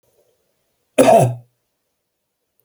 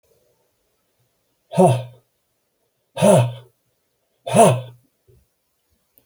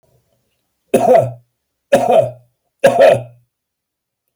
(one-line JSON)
{"cough_length": "2.6 s", "cough_amplitude": 32767, "cough_signal_mean_std_ratio": 0.3, "exhalation_length": "6.1 s", "exhalation_amplitude": 32388, "exhalation_signal_mean_std_ratio": 0.31, "three_cough_length": "4.4 s", "three_cough_amplitude": 29718, "three_cough_signal_mean_std_ratio": 0.41, "survey_phase": "alpha (2021-03-01 to 2021-08-12)", "age": "45-64", "gender": "Male", "wearing_mask": "No", "symptom_none": true, "smoker_status": "Never smoked", "respiratory_condition_asthma": false, "respiratory_condition_other": false, "recruitment_source": "REACT", "submission_delay": "1 day", "covid_test_result": "Negative", "covid_test_method": "RT-qPCR"}